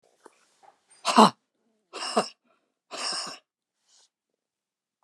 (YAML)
exhalation_length: 5.0 s
exhalation_amplitude: 27309
exhalation_signal_mean_std_ratio: 0.23
survey_phase: beta (2021-08-13 to 2022-03-07)
age: 65+
gender: Female
wearing_mask: 'No'
symptom_cough_any: true
symptom_fatigue: true
symptom_onset: 13 days
smoker_status: Never smoked
respiratory_condition_asthma: false
respiratory_condition_other: true
recruitment_source: REACT
submission_delay: 6 days
covid_test_result: Negative
covid_test_method: RT-qPCR
influenza_a_test_result: Negative
influenza_b_test_result: Negative